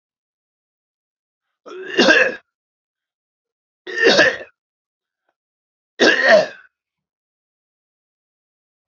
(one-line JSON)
{"three_cough_length": "8.9 s", "three_cough_amplitude": 32768, "three_cough_signal_mean_std_ratio": 0.3, "survey_phase": "alpha (2021-03-01 to 2021-08-12)", "age": "65+", "gender": "Male", "wearing_mask": "No", "symptom_none": true, "smoker_status": "Never smoked", "respiratory_condition_asthma": false, "respiratory_condition_other": false, "recruitment_source": "REACT", "submission_delay": "1 day", "covid_test_result": "Negative", "covid_test_method": "RT-qPCR"}